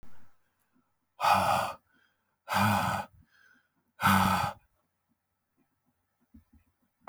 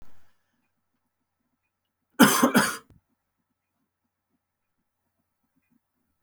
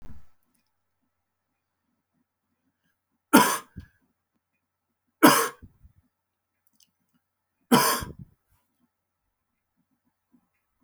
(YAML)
exhalation_length: 7.1 s
exhalation_amplitude: 9001
exhalation_signal_mean_std_ratio: 0.4
cough_length: 6.2 s
cough_amplitude: 25899
cough_signal_mean_std_ratio: 0.22
three_cough_length: 10.8 s
three_cough_amplitude: 27925
three_cough_signal_mean_std_ratio: 0.21
survey_phase: alpha (2021-03-01 to 2021-08-12)
age: 45-64
gender: Male
wearing_mask: 'No'
symptom_cough_any: true
symptom_fatigue: true
smoker_status: Never smoked
respiratory_condition_asthma: false
respiratory_condition_other: false
recruitment_source: Test and Trace
submission_delay: 2 days
covid_test_result: Positive
covid_test_method: RT-qPCR
covid_ct_value: 15.9
covid_ct_gene: N gene
covid_ct_mean: 16.5
covid_viral_load: 3700000 copies/ml
covid_viral_load_category: High viral load (>1M copies/ml)